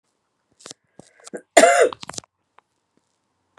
{"three_cough_length": "3.6 s", "three_cough_amplitude": 32768, "three_cough_signal_mean_std_ratio": 0.24, "survey_phase": "beta (2021-08-13 to 2022-03-07)", "age": "45-64", "gender": "Female", "wearing_mask": "No", "symptom_new_continuous_cough": true, "symptom_onset": "5 days", "smoker_status": "Never smoked", "respiratory_condition_asthma": false, "respiratory_condition_other": false, "recruitment_source": "Test and Trace", "submission_delay": "2 days", "covid_test_result": "Positive", "covid_test_method": "RT-qPCR", "covid_ct_value": 12.3, "covid_ct_gene": "ORF1ab gene", "covid_ct_mean": 12.7, "covid_viral_load": "68000000 copies/ml", "covid_viral_load_category": "High viral load (>1M copies/ml)"}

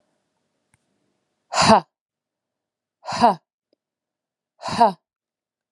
{"exhalation_length": "5.7 s", "exhalation_amplitude": 29933, "exhalation_signal_mean_std_ratio": 0.25, "survey_phase": "alpha (2021-03-01 to 2021-08-12)", "age": "45-64", "gender": "Female", "wearing_mask": "No", "symptom_shortness_of_breath": true, "symptom_fatigue": true, "symptom_headache": true, "symptom_onset": "11 days", "smoker_status": "Never smoked", "respiratory_condition_asthma": false, "respiratory_condition_other": true, "recruitment_source": "REACT", "submission_delay": "2 days", "covid_test_result": "Negative", "covid_test_method": "RT-qPCR"}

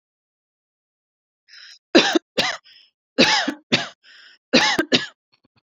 {"three_cough_length": "5.6 s", "three_cough_amplitude": 31316, "three_cough_signal_mean_std_ratio": 0.36, "survey_phase": "beta (2021-08-13 to 2022-03-07)", "age": "18-44", "gender": "Female", "wearing_mask": "No", "symptom_none": true, "smoker_status": "Never smoked", "respiratory_condition_asthma": false, "respiratory_condition_other": false, "recruitment_source": "REACT", "submission_delay": "1 day", "covid_test_result": "Negative", "covid_test_method": "RT-qPCR"}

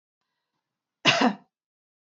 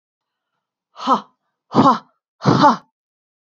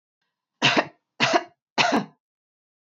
{"cough_length": "2.0 s", "cough_amplitude": 18658, "cough_signal_mean_std_ratio": 0.28, "exhalation_length": "3.6 s", "exhalation_amplitude": 29830, "exhalation_signal_mean_std_ratio": 0.34, "three_cough_length": "2.9 s", "three_cough_amplitude": 18748, "three_cough_signal_mean_std_ratio": 0.38, "survey_phase": "beta (2021-08-13 to 2022-03-07)", "age": "18-44", "gender": "Female", "wearing_mask": "No", "symptom_none": true, "symptom_onset": "2 days", "smoker_status": "Never smoked", "respiratory_condition_asthma": false, "respiratory_condition_other": false, "recruitment_source": "REACT", "submission_delay": "2 days", "covid_test_result": "Negative", "covid_test_method": "RT-qPCR", "influenza_a_test_result": "Unknown/Void", "influenza_b_test_result": "Unknown/Void"}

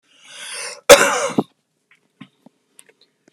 {"cough_length": "3.3 s", "cough_amplitude": 32768, "cough_signal_mean_std_ratio": 0.26, "survey_phase": "beta (2021-08-13 to 2022-03-07)", "age": "45-64", "gender": "Male", "wearing_mask": "No", "symptom_shortness_of_breath": true, "symptom_onset": "12 days", "smoker_status": "Never smoked", "respiratory_condition_asthma": true, "respiratory_condition_other": false, "recruitment_source": "REACT", "submission_delay": "1 day", "covid_test_result": "Positive", "covid_test_method": "RT-qPCR", "covid_ct_value": 21.0, "covid_ct_gene": "E gene", "influenza_a_test_result": "Negative", "influenza_b_test_result": "Negative"}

